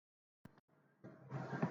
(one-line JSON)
{"cough_length": "1.7 s", "cough_amplitude": 1872, "cough_signal_mean_std_ratio": 0.41, "survey_phase": "alpha (2021-03-01 to 2021-08-12)", "age": "45-64", "gender": "Female", "wearing_mask": "No", "symptom_none": true, "smoker_status": "Ex-smoker", "respiratory_condition_asthma": false, "respiratory_condition_other": false, "recruitment_source": "REACT", "submission_delay": "3 days", "covid_test_result": "Negative", "covid_test_method": "RT-qPCR"}